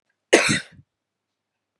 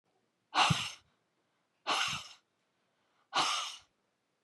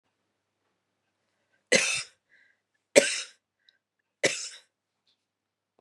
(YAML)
cough_length: 1.8 s
cough_amplitude: 32517
cough_signal_mean_std_ratio: 0.28
exhalation_length: 4.4 s
exhalation_amplitude: 6528
exhalation_signal_mean_std_ratio: 0.38
three_cough_length: 5.8 s
three_cough_amplitude: 32614
three_cough_signal_mean_std_ratio: 0.23
survey_phase: beta (2021-08-13 to 2022-03-07)
age: 18-44
gender: Female
wearing_mask: 'No'
symptom_cough_any: true
symptom_sore_throat: true
smoker_status: Never smoked
respiratory_condition_asthma: true
respiratory_condition_other: false
recruitment_source: Test and Trace
submission_delay: 1 day
covid_test_result: Negative
covid_test_method: ePCR